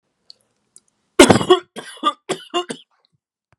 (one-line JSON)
{"three_cough_length": "3.6 s", "three_cough_amplitude": 32768, "three_cough_signal_mean_std_ratio": 0.28, "survey_phase": "beta (2021-08-13 to 2022-03-07)", "age": "18-44", "gender": "Male", "wearing_mask": "No", "symptom_none": true, "symptom_onset": "2 days", "smoker_status": "Never smoked", "respiratory_condition_asthma": false, "respiratory_condition_other": false, "recruitment_source": "REACT", "submission_delay": "0 days", "covid_test_result": "Negative", "covid_test_method": "RT-qPCR"}